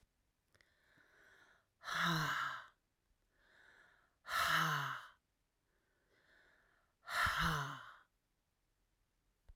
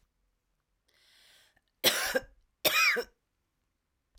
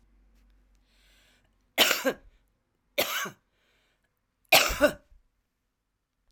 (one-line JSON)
{"exhalation_length": "9.6 s", "exhalation_amplitude": 2161, "exhalation_signal_mean_std_ratio": 0.4, "cough_length": "4.2 s", "cough_amplitude": 11131, "cough_signal_mean_std_ratio": 0.33, "three_cough_length": "6.3 s", "three_cough_amplitude": 22830, "three_cough_signal_mean_std_ratio": 0.28, "survey_phase": "alpha (2021-03-01 to 2021-08-12)", "age": "45-64", "gender": "Female", "wearing_mask": "No", "symptom_cough_any": true, "symptom_fatigue": true, "symptom_change_to_sense_of_smell_or_taste": true, "smoker_status": "Never smoked", "respiratory_condition_asthma": false, "respiratory_condition_other": false, "recruitment_source": "Test and Trace", "submission_delay": "2 days", "covid_test_result": "Positive", "covid_test_method": "RT-qPCR"}